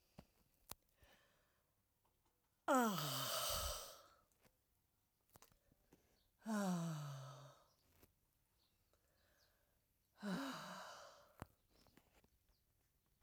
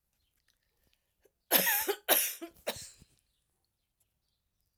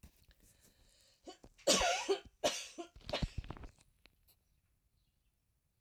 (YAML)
exhalation_length: 13.2 s
exhalation_amplitude: 1728
exhalation_signal_mean_std_ratio: 0.37
cough_length: 4.8 s
cough_amplitude: 13239
cough_signal_mean_std_ratio: 0.31
three_cough_length: 5.8 s
three_cough_amplitude: 6764
three_cough_signal_mean_std_ratio: 0.34
survey_phase: alpha (2021-03-01 to 2021-08-12)
age: 45-64
gender: Female
wearing_mask: 'No'
symptom_none: true
smoker_status: Never smoked
respiratory_condition_asthma: true
respiratory_condition_other: false
recruitment_source: REACT
submission_delay: 1 day
covid_test_result: Negative
covid_test_method: RT-qPCR